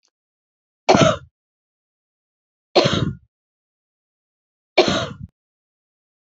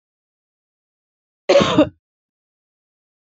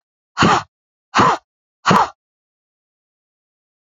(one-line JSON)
{"three_cough_length": "6.2 s", "three_cough_amplitude": 29780, "three_cough_signal_mean_std_ratio": 0.28, "cough_length": "3.2 s", "cough_amplitude": 29710, "cough_signal_mean_std_ratio": 0.26, "exhalation_length": "3.9 s", "exhalation_amplitude": 32768, "exhalation_signal_mean_std_ratio": 0.33, "survey_phase": "beta (2021-08-13 to 2022-03-07)", "age": "18-44", "gender": "Female", "wearing_mask": "No", "symptom_runny_or_blocked_nose": true, "smoker_status": "Ex-smoker", "respiratory_condition_asthma": true, "respiratory_condition_other": false, "recruitment_source": "REACT", "submission_delay": "1 day", "covid_test_result": "Negative", "covid_test_method": "RT-qPCR", "influenza_a_test_result": "Negative", "influenza_b_test_result": "Negative"}